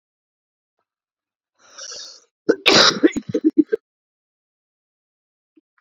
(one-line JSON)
{"cough_length": "5.8 s", "cough_amplitude": 32768, "cough_signal_mean_std_ratio": 0.27, "survey_phase": "beta (2021-08-13 to 2022-03-07)", "age": "45-64", "gender": "Male", "wearing_mask": "No", "symptom_cough_any": true, "symptom_runny_or_blocked_nose": true, "symptom_sore_throat": true, "symptom_fatigue": true, "symptom_fever_high_temperature": true, "symptom_change_to_sense_of_smell_or_taste": true, "symptom_loss_of_taste": true, "symptom_onset": "3 days", "smoker_status": "Never smoked", "respiratory_condition_asthma": false, "respiratory_condition_other": false, "recruitment_source": "Test and Trace", "submission_delay": "2 days", "covid_test_result": "Positive", "covid_test_method": "RT-qPCR", "covid_ct_value": 19.7, "covid_ct_gene": "ORF1ab gene"}